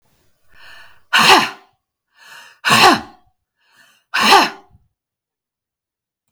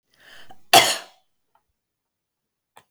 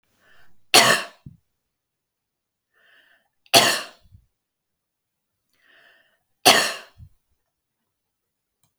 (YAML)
exhalation_length: 6.3 s
exhalation_amplitude: 32768
exhalation_signal_mean_std_ratio: 0.34
cough_length: 2.9 s
cough_amplitude: 32768
cough_signal_mean_std_ratio: 0.22
three_cough_length: 8.8 s
three_cough_amplitude: 32768
three_cough_signal_mean_std_ratio: 0.23
survey_phase: beta (2021-08-13 to 2022-03-07)
age: 45-64
gender: Female
wearing_mask: 'No'
symptom_none: true
smoker_status: Never smoked
respiratory_condition_asthma: false
respiratory_condition_other: false
recruitment_source: REACT
submission_delay: 1 day
covid_test_result: Negative
covid_test_method: RT-qPCR